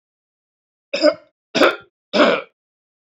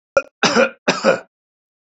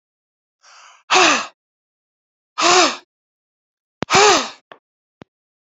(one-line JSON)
{"cough_length": "3.2 s", "cough_amplitude": 28732, "cough_signal_mean_std_ratio": 0.35, "three_cough_length": "2.0 s", "three_cough_amplitude": 32707, "three_cough_signal_mean_std_ratio": 0.41, "exhalation_length": "5.7 s", "exhalation_amplitude": 32768, "exhalation_signal_mean_std_ratio": 0.34, "survey_phase": "beta (2021-08-13 to 2022-03-07)", "age": "45-64", "gender": "Male", "wearing_mask": "No", "symptom_none": true, "smoker_status": "Never smoked", "respiratory_condition_asthma": false, "respiratory_condition_other": false, "recruitment_source": "REACT", "submission_delay": "1 day", "covid_test_result": "Negative", "covid_test_method": "RT-qPCR"}